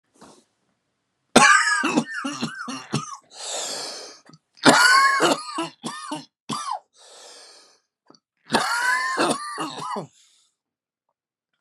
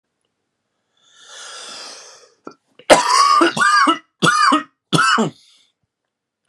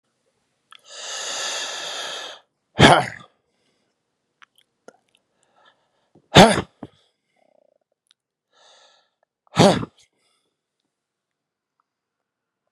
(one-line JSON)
{"three_cough_length": "11.6 s", "three_cough_amplitude": 32767, "three_cough_signal_mean_std_ratio": 0.45, "cough_length": "6.5 s", "cough_amplitude": 32768, "cough_signal_mean_std_ratio": 0.46, "exhalation_length": "12.7 s", "exhalation_amplitude": 32768, "exhalation_signal_mean_std_ratio": 0.22, "survey_phase": "beta (2021-08-13 to 2022-03-07)", "age": "45-64", "gender": "Male", "wearing_mask": "No", "symptom_cough_any": true, "symptom_runny_or_blocked_nose": true, "symptom_diarrhoea": true, "symptom_fatigue": true, "symptom_change_to_sense_of_smell_or_taste": true, "symptom_onset": "4 days", "smoker_status": "Never smoked", "respiratory_condition_asthma": false, "respiratory_condition_other": false, "recruitment_source": "Test and Trace", "submission_delay": "2 days", "covid_test_result": "Positive", "covid_test_method": "RT-qPCR", "covid_ct_value": 15.7, "covid_ct_gene": "N gene"}